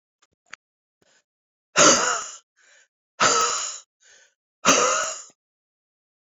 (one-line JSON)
{"exhalation_length": "6.4 s", "exhalation_amplitude": 27708, "exhalation_signal_mean_std_ratio": 0.37, "survey_phase": "beta (2021-08-13 to 2022-03-07)", "age": "45-64", "gender": "Female", "wearing_mask": "No", "symptom_cough_any": true, "symptom_shortness_of_breath": true, "symptom_abdominal_pain": true, "symptom_fatigue": true, "symptom_fever_high_temperature": true, "symptom_headache": true, "symptom_loss_of_taste": true, "symptom_onset": "4 days", "smoker_status": "Ex-smoker", "respiratory_condition_asthma": true, "respiratory_condition_other": false, "recruitment_source": "Test and Trace", "submission_delay": "2 days", "covid_test_result": "Positive", "covid_test_method": "ePCR"}